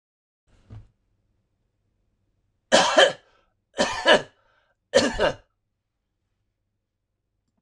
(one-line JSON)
{"three_cough_length": "7.6 s", "three_cough_amplitude": 26027, "three_cough_signal_mean_std_ratio": 0.28, "survey_phase": "alpha (2021-03-01 to 2021-08-12)", "age": "65+", "gender": "Male", "wearing_mask": "No", "symptom_none": true, "smoker_status": "Never smoked", "respiratory_condition_asthma": false, "respiratory_condition_other": false, "recruitment_source": "REACT", "submission_delay": "1 day", "covid_test_result": "Negative", "covid_test_method": "RT-qPCR"}